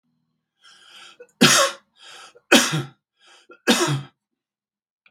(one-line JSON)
{"three_cough_length": "5.1 s", "three_cough_amplitude": 32768, "three_cough_signal_mean_std_ratio": 0.33, "survey_phase": "beta (2021-08-13 to 2022-03-07)", "age": "65+", "gender": "Male", "wearing_mask": "No", "symptom_none": true, "smoker_status": "Ex-smoker", "respiratory_condition_asthma": false, "respiratory_condition_other": false, "recruitment_source": "REACT", "submission_delay": "3 days", "covid_test_result": "Negative", "covid_test_method": "RT-qPCR", "influenza_a_test_result": "Negative", "influenza_b_test_result": "Negative"}